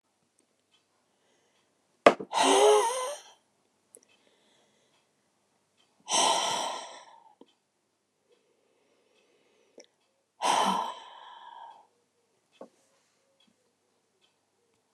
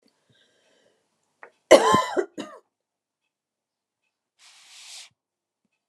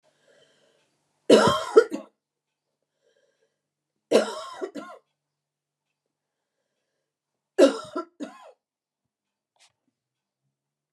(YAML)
exhalation_length: 14.9 s
exhalation_amplitude: 27430
exhalation_signal_mean_std_ratio: 0.28
cough_length: 5.9 s
cough_amplitude: 29204
cough_signal_mean_std_ratio: 0.2
three_cough_length: 10.9 s
three_cough_amplitude: 26721
three_cough_signal_mean_std_ratio: 0.22
survey_phase: alpha (2021-03-01 to 2021-08-12)
age: 65+
gender: Female
wearing_mask: 'No'
symptom_none: true
smoker_status: Ex-smoker
respiratory_condition_asthma: false
respiratory_condition_other: false
recruitment_source: REACT
submission_delay: 2 days
covid_test_result: Negative
covid_test_method: RT-qPCR